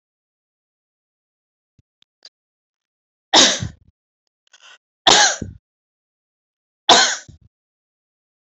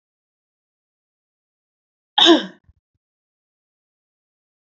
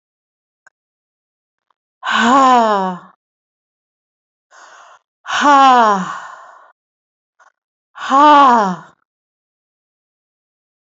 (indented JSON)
{
  "three_cough_length": "8.4 s",
  "three_cough_amplitude": 32768,
  "three_cough_signal_mean_std_ratio": 0.24,
  "cough_length": "4.8 s",
  "cough_amplitude": 28252,
  "cough_signal_mean_std_ratio": 0.18,
  "exhalation_length": "10.8 s",
  "exhalation_amplitude": 28692,
  "exhalation_signal_mean_std_ratio": 0.38,
  "survey_phase": "beta (2021-08-13 to 2022-03-07)",
  "age": "45-64",
  "gender": "Female",
  "wearing_mask": "No",
  "symptom_none": true,
  "smoker_status": "Never smoked",
  "respiratory_condition_asthma": false,
  "respiratory_condition_other": false,
  "recruitment_source": "REACT",
  "submission_delay": "2 days",
  "covid_test_result": "Negative",
  "covid_test_method": "RT-qPCR"
}